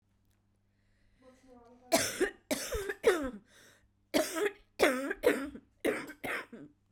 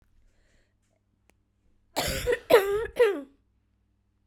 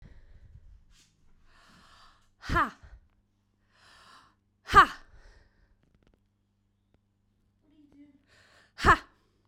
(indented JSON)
{
  "three_cough_length": "6.9 s",
  "three_cough_amplitude": 8725,
  "three_cough_signal_mean_std_ratio": 0.45,
  "cough_length": "4.3 s",
  "cough_amplitude": 17073,
  "cough_signal_mean_std_ratio": 0.35,
  "exhalation_length": "9.5 s",
  "exhalation_amplitude": 18617,
  "exhalation_signal_mean_std_ratio": 0.19,
  "survey_phase": "beta (2021-08-13 to 2022-03-07)",
  "age": "18-44",
  "gender": "Female",
  "wearing_mask": "No",
  "symptom_cough_any": true,
  "symptom_runny_or_blocked_nose": true,
  "symptom_sore_throat": true,
  "symptom_fatigue": true,
  "symptom_headache": true,
  "symptom_onset": "3 days",
  "smoker_status": "Never smoked",
  "respiratory_condition_asthma": false,
  "respiratory_condition_other": false,
  "recruitment_source": "Test and Trace",
  "submission_delay": "1 day",
  "covid_test_result": "Positive",
  "covid_test_method": "RT-qPCR",
  "covid_ct_value": 25.0,
  "covid_ct_gene": "ORF1ab gene",
  "covid_ct_mean": 25.5,
  "covid_viral_load": "4300 copies/ml",
  "covid_viral_load_category": "Minimal viral load (< 10K copies/ml)"
}